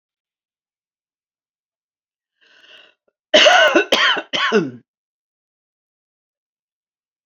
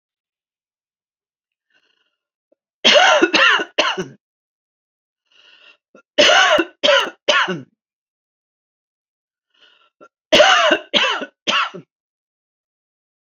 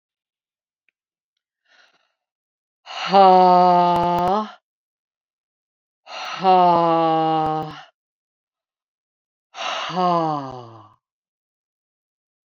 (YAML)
cough_length: 7.3 s
cough_amplitude: 29191
cough_signal_mean_std_ratio: 0.31
three_cough_length: 13.4 s
three_cough_amplitude: 30691
three_cough_signal_mean_std_ratio: 0.37
exhalation_length: 12.5 s
exhalation_amplitude: 26624
exhalation_signal_mean_std_ratio: 0.41
survey_phase: alpha (2021-03-01 to 2021-08-12)
age: 65+
gender: Female
wearing_mask: 'No'
symptom_none: true
smoker_status: Ex-smoker
respiratory_condition_asthma: false
respiratory_condition_other: false
recruitment_source: REACT
submission_delay: 1 day
covid_test_result: Negative
covid_test_method: RT-qPCR